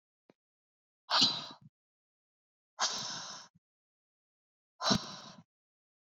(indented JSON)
{
  "exhalation_length": "6.1 s",
  "exhalation_amplitude": 7665,
  "exhalation_signal_mean_std_ratio": 0.3,
  "survey_phase": "beta (2021-08-13 to 2022-03-07)",
  "age": "45-64",
  "gender": "Female",
  "wearing_mask": "No",
  "symptom_cough_any": true,
  "symptom_sore_throat": true,
  "symptom_fatigue": true,
  "symptom_fever_high_temperature": true,
  "symptom_headache": true,
  "symptom_onset": "3 days",
  "smoker_status": "Never smoked",
  "respiratory_condition_asthma": false,
  "respiratory_condition_other": false,
  "recruitment_source": "Test and Trace",
  "submission_delay": "2 days",
  "covid_test_result": "Positive",
  "covid_test_method": "RT-qPCR",
  "covid_ct_value": 31.0,
  "covid_ct_gene": "N gene"
}